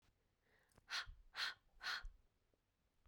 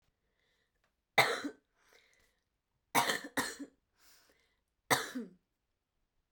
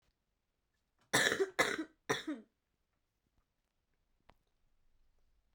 exhalation_length: 3.1 s
exhalation_amplitude: 922
exhalation_signal_mean_std_ratio: 0.41
three_cough_length: 6.3 s
three_cough_amplitude: 9012
three_cough_signal_mean_std_ratio: 0.28
cough_length: 5.5 s
cough_amplitude: 8005
cough_signal_mean_std_ratio: 0.28
survey_phase: beta (2021-08-13 to 2022-03-07)
age: 18-44
gender: Female
wearing_mask: 'No'
symptom_cough_any: true
symptom_runny_or_blocked_nose: true
symptom_onset: 10 days
smoker_status: Never smoked
respiratory_condition_asthma: false
respiratory_condition_other: false
recruitment_source: Test and Trace
submission_delay: 2 days
covid_test_result: Positive
covid_test_method: RT-qPCR
covid_ct_value: 23.3
covid_ct_gene: ORF1ab gene
covid_ct_mean: 23.9
covid_viral_load: 14000 copies/ml
covid_viral_load_category: Low viral load (10K-1M copies/ml)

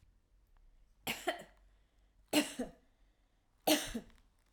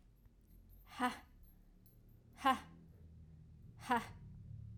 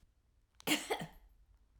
three_cough_length: 4.5 s
three_cough_amplitude: 5548
three_cough_signal_mean_std_ratio: 0.32
exhalation_length: 4.8 s
exhalation_amplitude: 2888
exhalation_signal_mean_std_ratio: 0.37
cough_length: 1.8 s
cough_amplitude: 3869
cough_signal_mean_std_ratio: 0.35
survey_phase: alpha (2021-03-01 to 2021-08-12)
age: 45-64
gender: Female
wearing_mask: 'No'
symptom_shortness_of_breath: true
symptom_fatigue: true
symptom_headache: true
symptom_change_to_sense_of_smell_or_taste: true
symptom_loss_of_taste: true
symptom_onset: 9 days
smoker_status: Never smoked
respiratory_condition_asthma: false
respiratory_condition_other: false
recruitment_source: Test and Trace
submission_delay: 2 days
covid_test_result: Positive
covid_test_method: RT-qPCR
covid_ct_value: 20.8
covid_ct_gene: ORF1ab gene
covid_ct_mean: 21.1
covid_viral_load: 120000 copies/ml
covid_viral_load_category: Low viral load (10K-1M copies/ml)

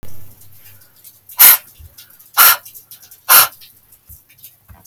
exhalation_length: 4.9 s
exhalation_amplitude: 32768
exhalation_signal_mean_std_ratio: 0.32
survey_phase: alpha (2021-03-01 to 2021-08-12)
age: 18-44
gender: Female
wearing_mask: 'No'
symptom_fatigue: true
smoker_status: Never smoked
respiratory_condition_asthma: true
respiratory_condition_other: false
recruitment_source: Test and Trace
submission_delay: 4 days
covid_test_result: Positive
covid_test_method: RT-qPCR
covid_ct_value: 22.4
covid_ct_gene: N gene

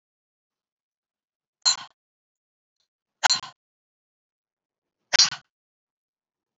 exhalation_length: 6.6 s
exhalation_amplitude: 26634
exhalation_signal_mean_std_ratio: 0.17
survey_phase: beta (2021-08-13 to 2022-03-07)
age: 18-44
gender: Female
wearing_mask: 'No'
symptom_none: true
smoker_status: Never smoked
respiratory_condition_asthma: false
respiratory_condition_other: false
recruitment_source: REACT
submission_delay: 1 day
covid_test_result: Negative
covid_test_method: RT-qPCR
influenza_a_test_result: Negative
influenza_b_test_result: Negative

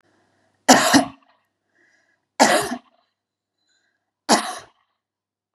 three_cough_length: 5.5 s
three_cough_amplitude: 32768
three_cough_signal_mean_std_ratio: 0.29
survey_phase: beta (2021-08-13 to 2022-03-07)
age: 18-44
gender: Female
wearing_mask: 'No'
symptom_none: true
smoker_status: Ex-smoker
respiratory_condition_asthma: false
respiratory_condition_other: false
recruitment_source: REACT
submission_delay: 6 days
covid_test_result: Negative
covid_test_method: RT-qPCR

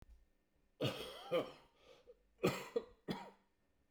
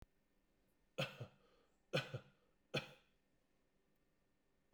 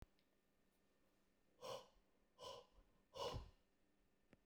cough_length: 3.9 s
cough_amplitude: 2714
cough_signal_mean_std_ratio: 0.39
three_cough_length: 4.7 s
three_cough_amplitude: 1877
three_cough_signal_mean_std_ratio: 0.27
exhalation_length: 4.5 s
exhalation_amplitude: 540
exhalation_signal_mean_std_ratio: 0.4
survey_phase: beta (2021-08-13 to 2022-03-07)
age: 45-64
gender: Male
wearing_mask: 'No'
symptom_cough_any: true
symptom_runny_or_blocked_nose: true
symptom_fatigue: true
smoker_status: Never smoked
respiratory_condition_asthma: false
respiratory_condition_other: false
recruitment_source: Test and Trace
submission_delay: 0 days
covid_test_result: Positive
covid_test_method: RT-qPCR
covid_ct_value: 19.4
covid_ct_gene: ORF1ab gene
covid_ct_mean: 20.9
covid_viral_load: 140000 copies/ml
covid_viral_load_category: Low viral load (10K-1M copies/ml)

